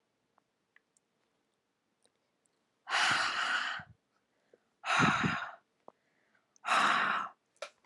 exhalation_length: 7.9 s
exhalation_amplitude: 5610
exhalation_signal_mean_std_ratio: 0.43
survey_phase: beta (2021-08-13 to 2022-03-07)
age: 18-44
gender: Female
wearing_mask: 'No'
symptom_runny_or_blocked_nose: true
symptom_change_to_sense_of_smell_or_taste: true
symptom_loss_of_taste: true
smoker_status: Never smoked
respiratory_condition_asthma: false
respiratory_condition_other: false
recruitment_source: Test and Trace
submission_delay: 4 days
covid_test_result: Positive
covid_test_method: LFT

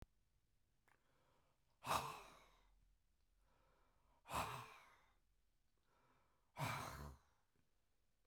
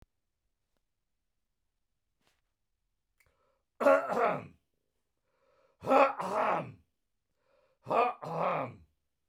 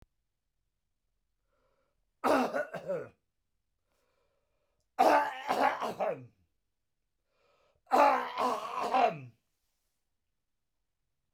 exhalation_length: 8.3 s
exhalation_amplitude: 1409
exhalation_signal_mean_std_ratio: 0.34
three_cough_length: 9.3 s
three_cough_amplitude: 9734
three_cough_signal_mean_std_ratio: 0.34
cough_length: 11.3 s
cough_amplitude: 9238
cough_signal_mean_std_ratio: 0.37
survey_phase: beta (2021-08-13 to 2022-03-07)
age: 65+
gender: Male
wearing_mask: 'No'
symptom_none: true
smoker_status: Ex-smoker
respiratory_condition_asthma: false
respiratory_condition_other: false
recruitment_source: REACT
submission_delay: 1 day
covid_test_result: Negative
covid_test_method: RT-qPCR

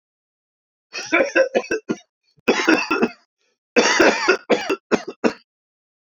three_cough_length: 6.1 s
three_cough_amplitude: 27241
three_cough_signal_mean_std_ratio: 0.46
survey_phase: beta (2021-08-13 to 2022-03-07)
age: 45-64
gender: Male
wearing_mask: 'No'
symptom_cough_any: true
symptom_fever_high_temperature: true
symptom_change_to_sense_of_smell_or_taste: true
symptom_onset: 3 days
smoker_status: Ex-smoker
respiratory_condition_asthma: false
respiratory_condition_other: false
recruitment_source: Test and Trace
submission_delay: 1 day
covid_test_result: Positive
covid_test_method: RT-qPCR
covid_ct_value: 15.5
covid_ct_gene: ORF1ab gene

